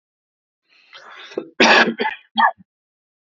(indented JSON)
{
  "cough_length": "3.3 s",
  "cough_amplitude": 29165,
  "cough_signal_mean_std_ratio": 0.35,
  "survey_phase": "beta (2021-08-13 to 2022-03-07)",
  "age": "45-64",
  "gender": "Male",
  "wearing_mask": "No",
  "symptom_cough_any": true,
  "smoker_status": "Ex-smoker",
  "respiratory_condition_asthma": false,
  "respiratory_condition_other": false,
  "recruitment_source": "REACT",
  "submission_delay": "1 day",
  "covid_test_result": "Negative",
  "covid_test_method": "RT-qPCR"
}